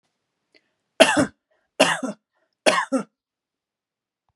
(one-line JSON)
{"three_cough_length": "4.4 s", "three_cough_amplitude": 32768, "three_cough_signal_mean_std_ratio": 0.3, "survey_phase": "beta (2021-08-13 to 2022-03-07)", "age": "45-64", "gender": "Female", "wearing_mask": "No", "symptom_sore_throat": true, "symptom_onset": "9 days", "smoker_status": "Never smoked", "respiratory_condition_asthma": false, "respiratory_condition_other": false, "recruitment_source": "REACT", "submission_delay": "2 days", "covid_test_result": "Negative", "covid_test_method": "RT-qPCR", "influenza_a_test_result": "Negative", "influenza_b_test_result": "Negative"}